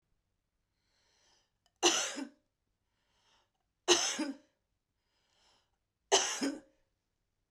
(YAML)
three_cough_length: 7.5 s
three_cough_amplitude: 10502
three_cough_signal_mean_std_ratio: 0.29
survey_phase: beta (2021-08-13 to 2022-03-07)
age: 45-64
gender: Female
wearing_mask: 'No'
symptom_change_to_sense_of_smell_or_taste: true
symptom_loss_of_taste: true
symptom_onset: 6 days
smoker_status: Never smoked
respiratory_condition_asthma: true
respiratory_condition_other: false
recruitment_source: Test and Trace
submission_delay: 2 days
covid_test_result: Positive
covid_test_method: RT-qPCR